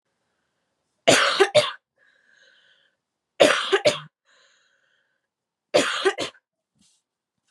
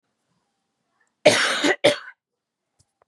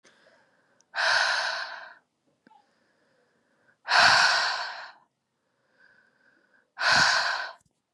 three_cough_length: 7.5 s
three_cough_amplitude: 27955
three_cough_signal_mean_std_ratio: 0.32
cough_length: 3.1 s
cough_amplitude: 30492
cough_signal_mean_std_ratio: 0.33
exhalation_length: 7.9 s
exhalation_amplitude: 18773
exhalation_signal_mean_std_ratio: 0.43
survey_phase: beta (2021-08-13 to 2022-03-07)
age: 18-44
gender: Female
wearing_mask: 'No'
symptom_cough_any: true
symptom_abdominal_pain: true
symptom_diarrhoea: true
symptom_onset: 2 days
smoker_status: Never smoked
respiratory_condition_asthma: false
respiratory_condition_other: false
recruitment_source: Test and Trace
submission_delay: 1 day
covid_test_result: Positive
covid_test_method: ePCR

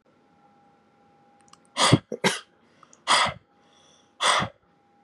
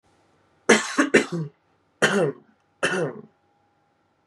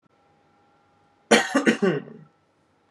exhalation_length: 5.0 s
exhalation_amplitude: 18114
exhalation_signal_mean_std_ratio: 0.33
three_cough_length: 4.3 s
three_cough_amplitude: 29755
three_cough_signal_mean_std_ratio: 0.38
cough_length: 2.9 s
cough_amplitude: 26531
cough_signal_mean_std_ratio: 0.34
survey_phase: beta (2021-08-13 to 2022-03-07)
age: 18-44
gender: Male
wearing_mask: 'No'
symptom_runny_or_blocked_nose: true
symptom_sore_throat: true
symptom_onset: 4 days
smoker_status: Never smoked
respiratory_condition_asthma: false
respiratory_condition_other: false
recruitment_source: Test and Trace
submission_delay: 2 days
covid_test_result: Positive
covid_test_method: RT-qPCR
covid_ct_value: 25.6
covid_ct_gene: N gene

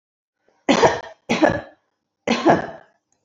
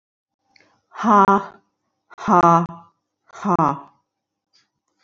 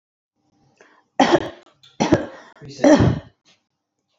cough_length: 3.2 s
cough_amplitude: 27316
cough_signal_mean_std_ratio: 0.41
exhalation_length: 5.0 s
exhalation_amplitude: 27474
exhalation_signal_mean_std_ratio: 0.36
three_cough_length: 4.2 s
three_cough_amplitude: 27758
three_cough_signal_mean_std_ratio: 0.35
survey_phase: beta (2021-08-13 to 2022-03-07)
age: 45-64
gender: Female
wearing_mask: 'No'
symptom_none: true
smoker_status: Never smoked
respiratory_condition_asthma: false
respiratory_condition_other: false
recruitment_source: REACT
submission_delay: 4 days
covid_test_result: Negative
covid_test_method: RT-qPCR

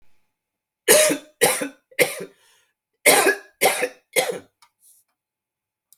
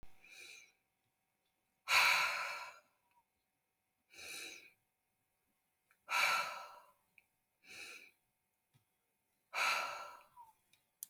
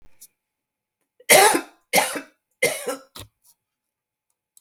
cough_length: 6.0 s
cough_amplitude: 32768
cough_signal_mean_std_ratio: 0.37
exhalation_length: 11.1 s
exhalation_amplitude: 4246
exhalation_signal_mean_std_ratio: 0.34
three_cough_length: 4.6 s
three_cough_amplitude: 32768
three_cough_signal_mean_std_ratio: 0.3
survey_phase: beta (2021-08-13 to 2022-03-07)
age: 18-44
gender: Female
wearing_mask: 'No'
symptom_none: true
symptom_onset: 6 days
smoker_status: Never smoked
respiratory_condition_asthma: false
respiratory_condition_other: false
recruitment_source: REACT
submission_delay: 1 day
covid_test_result: Negative
covid_test_method: RT-qPCR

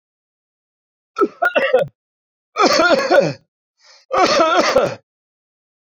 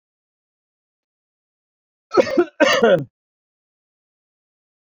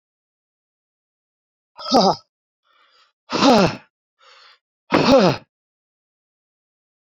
three_cough_length: 5.8 s
three_cough_amplitude: 28744
three_cough_signal_mean_std_ratio: 0.51
cough_length: 4.9 s
cough_amplitude: 27583
cough_signal_mean_std_ratio: 0.29
exhalation_length: 7.2 s
exhalation_amplitude: 25193
exhalation_signal_mean_std_ratio: 0.31
survey_phase: beta (2021-08-13 to 2022-03-07)
age: 65+
gender: Male
wearing_mask: 'No'
symptom_cough_any: true
symptom_runny_or_blocked_nose: true
smoker_status: Never smoked
respiratory_condition_asthma: false
respiratory_condition_other: false
recruitment_source: Test and Trace
submission_delay: 0 days
covid_test_result: Positive
covid_test_method: LFT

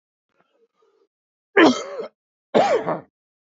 cough_length: 3.4 s
cough_amplitude: 27134
cough_signal_mean_std_ratio: 0.34
survey_phase: alpha (2021-03-01 to 2021-08-12)
age: 18-44
gender: Male
wearing_mask: 'No'
symptom_cough_any: true
symptom_new_continuous_cough: true
symptom_shortness_of_breath: true
symptom_abdominal_pain: true
symptom_fatigue: true
symptom_fever_high_temperature: true
symptom_headache: true
symptom_change_to_sense_of_smell_or_taste: true
symptom_loss_of_taste: true
symptom_onset: 3 days
smoker_status: Current smoker (1 to 10 cigarettes per day)
respiratory_condition_asthma: false
respiratory_condition_other: false
recruitment_source: Test and Trace
submission_delay: 2 days
covid_test_result: Positive
covid_test_method: RT-qPCR
covid_ct_value: 13.1
covid_ct_gene: ORF1ab gene
covid_ct_mean: 13.4
covid_viral_load: 41000000 copies/ml
covid_viral_load_category: High viral load (>1M copies/ml)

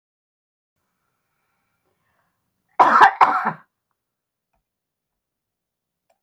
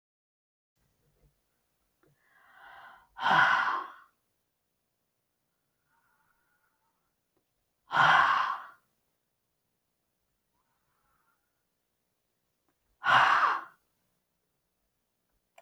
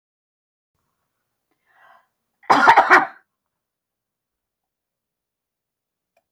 three_cough_length: 6.2 s
three_cough_amplitude: 31980
three_cough_signal_mean_std_ratio: 0.23
exhalation_length: 15.6 s
exhalation_amplitude: 10624
exhalation_signal_mean_std_ratio: 0.27
cough_length: 6.3 s
cough_amplitude: 31676
cough_signal_mean_std_ratio: 0.22
survey_phase: beta (2021-08-13 to 2022-03-07)
age: 65+
gender: Female
wearing_mask: 'No'
symptom_none: true
smoker_status: Never smoked
respiratory_condition_asthma: false
respiratory_condition_other: false
recruitment_source: Test and Trace
submission_delay: 0 days
covid_test_result: Negative
covid_test_method: LFT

